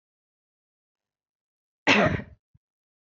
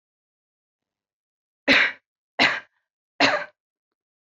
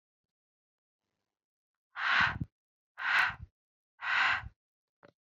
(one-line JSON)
{"cough_length": "3.1 s", "cough_amplitude": 16713, "cough_signal_mean_std_ratio": 0.25, "three_cough_length": "4.3 s", "three_cough_amplitude": 21529, "three_cough_signal_mean_std_ratio": 0.3, "exhalation_length": "5.3 s", "exhalation_amplitude": 6562, "exhalation_signal_mean_std_ratio": 0.38, "survey_phase": "beta (2021-08-13 to 2022-03-07)", "age": "18-44", "gender": "Female", "wearing_mask": "No", "symptom_cough_any": true, "symptom_runny_or_blocked_nose": true, "symptom_headache": true, "smoker_status": "Current smoker (e-cigarettes or vapes only)", "respiratory_condition_asthma": false, "respiratory_condition_other": false, "recruitment_source": "Test and Trace", "submission_delay": "1 day", "covid_test_result": "Positive", "covid_test_method": "RT-qPCR", "covid_ct_value": 25.0, "covid_ct_gene": "ORF1ab gene", "covid_ct_mean": 25.3, "covid_viral_load": "4900 copies/ml", "covid_viral_load_category": "Minimal viral load (< 10K copies/ml)"}